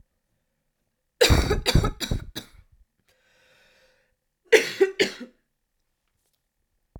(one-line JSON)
{"cough_length": "7.0 s", "cough_amplitude": 28506, "cough_signal_mean_std_ratio": 0.31, "survey_phase": "beta (2021-08-13 to 2022-03-07)", "age": "18-44", "gender": "Female", "wearing_mask": "No", "symptom_cough_any": true, "symptom_runny_or_blocked_nose": true, "symptom_sore_throat": true, "symptom_fatigue": true, "symptom_headache": true, "symptom_loss_of_taste": true, "symptom_onset": "2 days", "smoker_status": "Never smoked", "respiratory_condition_asthma": false, "respiratory_condition_other": false, "recruitment_source": "Test and Trace", "submission_delay": "2 days", "covid_test_result": "Positive", "covid_test_method": "RT-qPCR"}